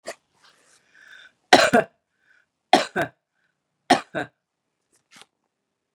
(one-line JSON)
{"three_cough_length": "5.9 s", "three_cough_amplitude": 32768, "three_cough_signal_mean_std_ratio": 0.23, "survey_phase": "beta (2021-08-13 to 2022-03-07)", "age": "45-64", "gender": "Female", "wearing_mask": "No", "symptom_none": true, "smoker_status": "Ex-smoker", "respiratory_condition_asthma": false, "respiratory_condition_other": false, "recruitment_source": "REACT", "submission_delay": "3 days", "covid_test_result": "Negative", "covid_test_method": "RT-qPCR", "influenza_a_test_result": "Negative", "influenza_b_test_result": "Negative"}